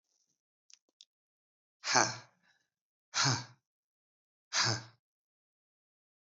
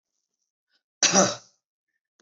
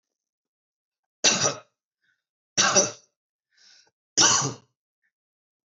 {"exhalation_length": "6.2 s", "exhalation_amplitude": 11059, "exhalation_signal_mean_std_ratio": 0.27, "cough_length": "2.2 s", "cough_amplitude": 18550, "cough_signal_mean_std_ratio": 0.28, "three_cough_length": "5.7 s", "three_cough_amplitude": 16831, "three_cough_signal_mean_std_ratio": 0.31, "survey_phase": "beta (2021-08-13 to 2022-03-07)", "age": "45-64", "gender": "Male", "wearing_mask": "No", "symptom_none": true, "smoker_status": "Ex-smoker", "respiratory_condition_asthma": false, "respiratory_condition_other": false, "recruitment_source": "REACT", "submission_delay": "2 days", "covid_test_result": "Negative", "covid_test_method": "RT-qPCR", "influenza_a_test_result": "Negative", "influenza_b_test_result": "Negative"}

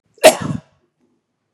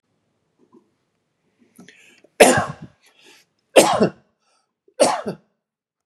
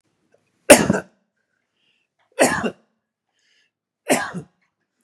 {"cough_length": "1.5 s", "cough_amplitude": 32768, "cough_signal_mean_std_ratio": 0.26, "three_cough_length": "6.1 s", "three_cough_amplitude": 32768, "three_cough_signal_mean_std_ratio": 0.27, "exhalation_length": "5.0 s", "exhalation_amplitude": 32768, "exhalation_signal_mean_std_ratio": 0.25, "survey_phase": "beta (2021-08-13 to 2022-03-07)", "age": "45-64", "gender": "Male", "wearing_mask": "No", "symptom_none": true, "smoker_status": "Never smoked", "respiratory_condition_asthma": false, "respiratory_condition_other": false, "recruitment_source": "REACT", "submission_delay": "2 days", "covid_test_result": "Negative", "covid_test_method": "RT-qPCR", "influenza_a_test_result": "Negative", "influenza_b_test_result": "Negative"}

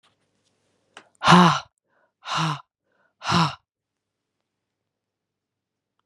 {"exhalation_length": "6.1 s", "exhalation_amplitude": 28041, "exhalation_signal_mean_std_ratio": 0.27, "survey_phase": "beta (2021-08-13 to 2022-03-07)", "age": "45-64", "gender": "Female", "wearing_mask": "No", "symptom_runny_or_blocked_nose": true, "symptom_fatigue": true, "symptom_fever_high_temperature": true, "symptom_headache": true, "smoker_status": "Ex-smoker", "respiratory_condition_asthma": false, "respiratory_condition_other": false, "recruitment_source": "Test and Trace", "submission_delay": "3 days", "covid_test_result": "Positive", "covid_test_method": "RT-qPCR"}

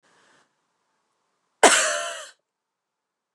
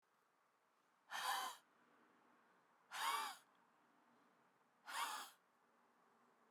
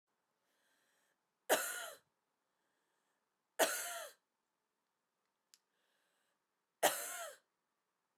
{"cough_length": "3.3 s", "cough_amplitude": 29203, "cough_signal_mean_std_ratio": 0.26, "exhalation_length": "6.5 s", "exhalation_amplitude": 1049, "exhalation_signal_mean_std_ratio": 0.39, "three_cough_length": "8.2 s", "three_cough_amplitude": 4875, "three_cough_signal_mean_std_ratio": 0.25, "survey_phase": "beta (2021-08-13 to 2022-03-07)", "age": "45-64", "gender": "Female", "wearing_mask": "No", "symptom_cough_any": true, "symptom_runny_or_blocked_nose": true, "symptom_fatigue": true, "symptom_fever_high_temperature": true, "symptom_onset": "7 days", "smoker_status": "Never smoked", "respiratory_condition_asthma": false, "respiratory_condition_other": false, "recruitment_source": "Test and Trace", "submission_delay": "2 days", "covid_test_result": "Positive", "covid_test_method": "RT-qPCR", "covid_ct_value": 22.8, "covid_ct_gene": "S gene", "covid_ct_mean": 23.4, "covid_viral_load": "21000 copies/ml", "covid_viral_load_category": "Low viral load (10K-1M copies/ml)"}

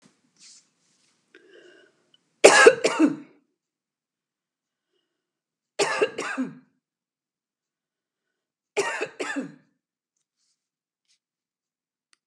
{"three_cough_length": "12.3 s", "three_cough_amplitude": 32768, "three_cough_signal_mean_std_ratio": 0.22, "survey_phase": "beta (2021-08-13 to 2022-03-07)", "age": "65+", "gender": "Female", "wearing_mask": "No", "symptom_none": true, "smoker_status": "Never smoked", "respiratory_condition_asthma": false, "respiratory_condition_other": false, "recruitment_source": "REACT", "submission_delay": "1 day", "covid_test_result": "Negative", "covid_test_method": "RT-qPCR", "influenza_a_test_result": "Negative", "influenza_b_test_result": "Negative"}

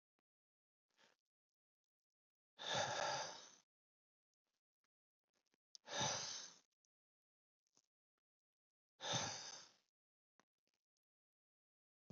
{"exhalation_length": "12.1 s", "exhalation_amplitude": 1251, "exhalation_signal_mean_std_ratio": 0.31, "survey_phase": "beta (2021-08-13 to 2022-03-07)", "age": "65+", "gender": "Male", "wearing_mask": "No", "symptom_none": true, "smoker_status": "Never smoked", "respiratory_condition_asthma": false, "respiratory_condition_other": false, "recruitment_source": "REACT", "submission_delay": "5 days", "covid_test_result": "Negative", "covid_test_method": "RT-qPCR", "influenza_a_test_result": "Negative", "influenza_b_test_result": "Negative"}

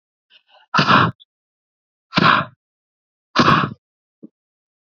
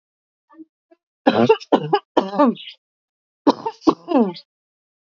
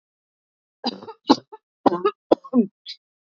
{"exhalation_length": "4.9 s", "exhalation_amplitude": 28706, "exhalation_signal_mean_std_ratio": 0.35, "three_cough_length": "5.1 s", "three_cough_amplitude": 27339, "three_cough_signal_mean_std_ratio": 0.36, "cough_length": "3.2 s", "cough_amplitude": 31998, "cough_signal_mean_std_ratio": 0.28, "survey_phase": "beta (2021-08-13 to 2022-03-07)", "age": "45-64", "gender": "Female", "wearing_mask": "No", "symptom_cough_any": true, "symptom_fatigue": true, "smoker_status": "Ex-smoker", "respiratory_condition_asthma": false, "respiratory_condition_other": false, "recruitment_source": "REACT", "submission_delay": "2 days", "covid_test_result": "Negative", "covid_test_method": "RT-qPCR", "influenza_a_test_result": "Unknown/Void", "influenza_b_test_result": "Unknown/Void"}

